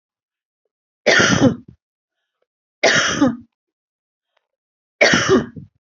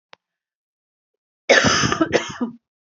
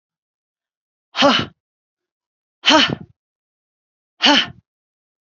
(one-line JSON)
{"three_cough_length": "5.8 s", "three_cough_amplitude": 28741, "three_cough_signal_mean_std_ratio": 0.4, "cough_length": "2.8 s", "cough_amplitude": 27677, "cough_signal_mean_std_ratio": 0.41, "exhalation_length": "5.2 s", "exhalation_amplitude": 31430, "exhalation_signal_mean_std_ratio": 0.3, "survey_phase": "beta (2021-08-13 to 2022-03-07)", "age": "45-64", "gender": "Female", "wearing_mask": "No", "symptom_cough_any": true, "symptom_shortness_of_breath": true, "symptom_sore_throat": true, "symptom_change_to_sense_of_smell_or_taste": true, "smoker_status": "Never smoked", "respiratory_condition_asthma": true, "respiratory_condition_other": false, "recruitment_source": "Test and Trace", "submission_delay": "1 day", "covid_test_result": "Positive", "covid_test_method": "RT-qPCR"}